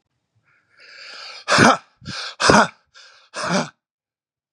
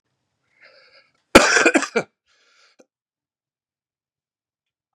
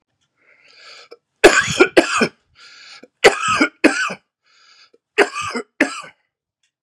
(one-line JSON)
{"exhalation_length": "4.5 s", "exhalation_amplitude": 32768, "exhalation_signal_mean_std_ratio": 0.35, "cough_length": "4.9 s", "cough_amplitude": 32768, "cough_signal_mean_std_ratio": 0.22, "three_cough_length": "6.8 s", "three_cough_amplitude": 32768, "three_cough_signal_mean_std_ratio": 0.35, "survey_phase": "beta (2021-08-13 to 2022-03-07)", "age": "45-64", "gender": "Male", "wearing_mask": "Yes", "symptom_cough_any": true, "symptom_shortness_of_breath": true, "symptom_sore_throat": true, "symptom_headache": true, "smoker_status": "Never smoked", "respiratory_condition_asthma": true, "respiratory_condition_other": false, "recruitment_source": "Test and Trace", "submission_delay": "2 days", "covid_test_result": "Positive", "covid_test_method": "RT-qPCR", "covid_ct_value": 26.4, "covid_ct_gene": "ORF1ab gene", "covid_ct_mean": 26.6, "covid_viral_load": "1800 copies/ml", "covid_viral_load_category": "Minimal viral load (< 10K copies/ml)"}